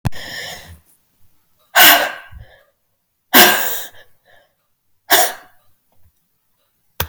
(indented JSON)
{
  "exhalation_length": "7.1 s",
  "exhalation_amplitude": 32768,
  "exhalation_signal_mean_std_ratio": 0.33,
  "survey_phase": "beta (2021-08-13 to 2022-03-07)",
  "age": "45-64",
  "gender": "Female",
  "wearing_mask": "No",
  "symptom_none": true,
  "smoker_status": "Ex-smoker",
  "respiratory_condition_asthma": false,
  "respiratory_condition_other": false,
  "recruitment_source": "REACT",
  "submission_delay": "9 days",
  "covid_test_result": "Negative",
  "covid_test_method": "RT-qPCR"
}